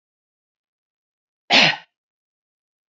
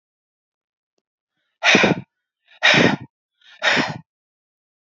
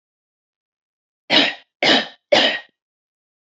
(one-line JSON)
{"cough_length": "2.9 s", "cough_amplitude": 27814, "cough_signal_mean_std_ratio": 0.22, "exhalation_length": "4.9 s", "exhalation_amplitude": 27995, "exhalation_signal_mean_std_ratio": 0.35, "three_cough_length": "3.4 s", "three_cough_amplitude": 29159, "three_cough_signal_mean_std_ratio": 0.36, "survey_phase": "beta (2021-08-13 to 2022-03-07)", "age": "18-44", "gender": "Female", "wearing_mask": "No", "symptom_none": true, "smoker_status": "Never smoked", "respiratory_condition_asthma": false, "respiratory_condition_other": false, "recruitment_source": "REACT", "submission_delay": "2 days", "covid_test_result": "Negative", "covid_test_method": "RT-qPCR", "influenza_a_test_result": "Negative", "influenza_b_test_result": "Negative"}